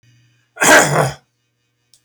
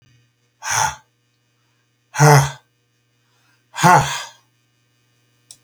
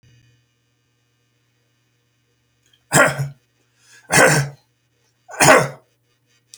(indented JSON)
{
  "cough_length": "2.0 s",
  "cough_amplitude": 32768,
  "cough_signal_mean_std_ratio": 0.39,
  "exhalation_length": "5.6 s",
  "exhalation_amplitude": 32768,
  "exhalation_signal_mean_std_ratio": 0.31,
  "three_cough_length": "6.6 s",
  "three_cough_amplitude": 32768,
  "three_cough_signal_mean_std_ratio": 0.3,
  "survey_phase": "beta (2021-08-13 to 2022-03-07)",
  "age": "65+",
  "gender": "Male",
  "wearing_mask": "No",
  "symptom_none": true,
  "smoker_status": "Ex-smoker",
  "respiratory_condition_asthma": false,
  "respiratory_condition_other": false,
  "recruitment_source": "REACT",
  "submission_delay": "10 days",
  "covid_test_result": "Negative",
  "covid_test_method": "RT-qPCR",
  "influenza_a_test_result": "Negative",
  "influenza_b_test_result": "Negative"
}